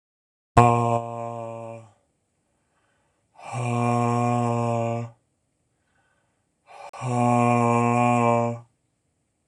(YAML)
exhalation_length: 9.5 s
exhalation_amplitude: 26027
exhalation_signal_mean_std_ratio: 0.47
survey_phase: beta (2021-08-13 to 2022-03-07)
age: 18-44
gender: Male
wearing_mask: 'No'
symptom_cough_any: true
symptom_shortness_of_breath: true
symptom_sore_throat: true
symptom_fatigue: true
symptom_headache: true
symptom_change_to_sense_of_smell_or_taste: true
smoker_status: Never smoked
respiratory_condition_asthma: false
respiratory_condition_other: false
recruitment_source: Test and Trace
submission_delay: 2 days
covid_test_result: Positive
covid_test_method: RT-qPCR
covid_ct_value: 20.7
covid_ct_gene: ORF1ab gene
covid_ct_mean: 21.2
covid_viral_load: 110000 copies/ml
covid_viral_load_category: Low viral load (10K-1M copies/ml)